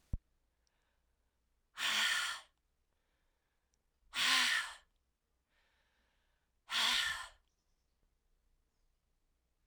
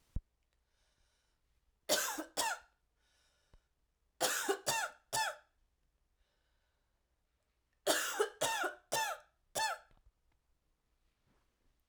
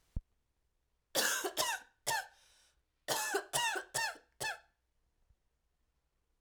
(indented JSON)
{
  "exhalation_length": "9.7 s",
  "exhalation_amplitude": 4259,
  "exhalation_signal_mean_std_ratio": 0.34,
  "three_cough_length": "11.9 s",
  "three_cough_amplitude": 4725,
  "three_cough_signal_mean_std_ratio": 0.38,
  "cough_length": "6.4 s",
  "cough_amplitude": 4163,
  "cough_signal_mean_std_ratio": 0.44,
  "survey_phase": "alpha (2021-03-01 to 2021-08-12)",
  "age": "18-44",
  "gender": "Female",
  "wearing_mask": "No",
  "symptom_cough_any": true,
  "symptom_fatigue": true,
  "symptom_headache": true,
  "symptom_change_to_sense_of_smell_or_taste": true,
  "symptom_loss_of_taste": true,
  "symptom_onset": "4 days",
  "smoker_status": "Never smoked",
  "respiratory_condition_asthma": false,
  "respiratory_condition_other": false,
  "recruitment_source": "Test and Trace",
  "submission_delay": "2 days",
  "covid_test_result": "Positive",
  "covid_test_method": "RT-qPCR",
  "covid_ct_value": 12.8,
  "covid_ct_gene": "ORF1ab gene",
  "covid_ct_mean": 13.3,
  "covid_viral_load": "45000000 copies/ml",
  "covid_viral_load_category": "High viral load (>1M copies/ml)"
}